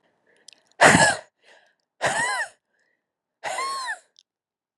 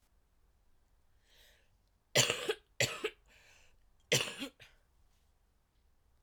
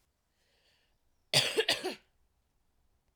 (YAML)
exhalation_length: 4.8 s
exhalation_amplitude: 32574
exhalation_signal_mean_std_ratio: 0.35
three_cough_length: 6.2 s
three_cough_amplitude: 7524
three_cough_signal_mean_std_ratio: 0.28
cough_length: 3.2 s
cough_amplitude: 9783
cough_signal_mean_std_ratio: 0.29
survey_phase: alpha (2021-03-01 to 2021-08-12)
age: 18-44
gender: Female
wearing_mask: 'No'
symptom_cough_any: true
symptom_diarrhoea: true
symptom_fatigue: true
symptom_headache: true
symptom_change_to_sense_of_smell_or_taste: true
symptom_loss_of_taste: true
symptom_onset: 3 days
smoker_status: Never smoked
respiratory_condition_asthma: false
respiratory_condition_other: false
recruitment_source: Test and Trace
submission_delay: 2 days
covid_test_result: Positive
covid_test_method: RT-qPCR
covid_ct_value: 12.5
covid_ct_gene: ORF1ab gene
covid_ct_mean: 13.0
covid_viral_load: 54000000 copies/ml
covid_viral_load_category: High viral load (>1M copies/ml)